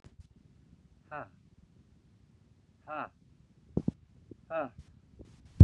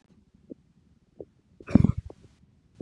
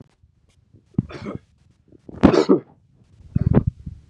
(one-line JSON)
{"exhalation_length": "5.6 s", "exhalation_amplitude": 21154, "exhalation_signal_mean_std_ratio": 0.14, "cough_length": "2.8 s", "cough_amplitude": 24820, "cough_signal_mean_std_ratio": 0.18, "three_cough_length": "4.1 s", "three_cough_amplitude": 32768, "three_cough_signal_mean_std_ratio": 0.31, "survey_phase": "beta (2021-08-13 to 2022-03-07)", "age": "18-44", "gender": "Male", "wearing_mask": "No", "symptom_cough_any": true, "symptom_runny_or_blocked_nose": true, "symptom_headache": true, "smoker_status": "Never smoked", "respiratory_condition_asthma": false, "respiratory_condition_other": false, "recruitment_source": "Test and Trace", "submission_delay": "2 days", "covid_test_result": "Positive", "covid_test_method": "LFT"}